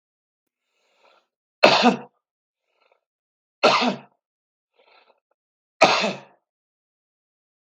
three_cough_length: 7.8 s
three_cough_amplitude: 32768
three_cough_signal_mean_std_ratio: 0.26
survey_phase: beta (2021-08-13 to 2022-03-07)
age: 45-64
gender: Male
wearing_mask: 'No'
symptom_none: true
smoker_status: Never smoked
respiratory_condition_asthma: false
respiratory_condition_other: false
recruitment_source: REACT
submission_delay: 2 days
covid_test_result: Negative
covid_test_method: RT-qPCR
influenza_a_test_result: Negative
influenza_b_test_result: Negative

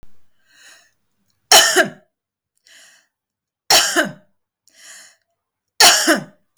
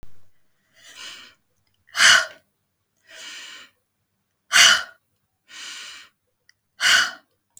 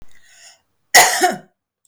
three_cough_length: 6.6 s
three_cough_amplitude: 32768
three_cough_signal_mean_std_ratio: 0.33
exhalation_length: 7.6 s
exhalation_amplitude: 32375
exhalation_signal_mean_std_ratio: 0.3
cough_length: 1.9 s
cough_amplitude: 32768
cough_signal_mean_std_ratio: 0.37
survey_phase: beta (2021-08-13 to 2022-03-07)
age: 45-64
gender: Female
wearing_mask: 'Yes'
symptom_none: true
symptom_onset: 12 days
smoker_status: Never smoked
respiratory_condition_asthma: false
respiratory_condition_other: false
recruitment_source: REACT
submission_delay: 2 days
covid_test_result: Negative
covid_test_method: RT-qPCR
influenza_a_test_result: Negative
influenza_b_test_result: Negative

